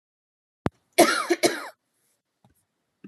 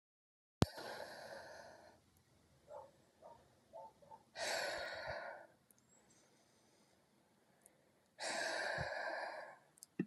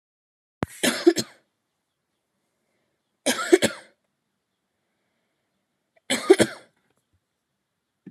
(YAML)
cough_length: 3.1 s
cough_amplitude: 23203
cough_signal_mean_std_ratio: 0.29
exhalation_length: 10.1 s
exhalation_amplitude: 6399
exhalation_signal_mean_std_ratio: 0.46
three_cough_length: 8.1 s
three_cough_amplitude: 28054
three_cough_signal_mean_std_ratio: 0.22
survey_phase: alpha (2021-03-01 to 2021-08-12)
age: 18-44
gender: Female
wearing_mask: 'Yes'
symptom_none: true
smoker_status: Never smoked
respiratory_condition_asthma: false
respiratory_condition_other: false
recruitment_source: REACT
submission_delay: 2 days
covid_test_result: Negative
covid_test_method: RT-qPCR